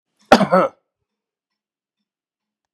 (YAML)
cough_length: 2.7 s
cough_amplitude: 32768
cough_signal_mean_std_ratio: 0.24
survey_phase: beta (2021-08-13 to 2022-03-07)
age: 65+
gender: Male
wearing_mask: 'No'
symptom_none: true
smoker_status: Never smoked
respiratory_condition_asthma: false
respiratory_condition_other: false
recruitment_source: REACT
submission_delay: 2 days
covid_test_result: Negative
covid_test_method: RT-qPCR
influenza_a_test_result: Negative
influenza_b_test_result: Negative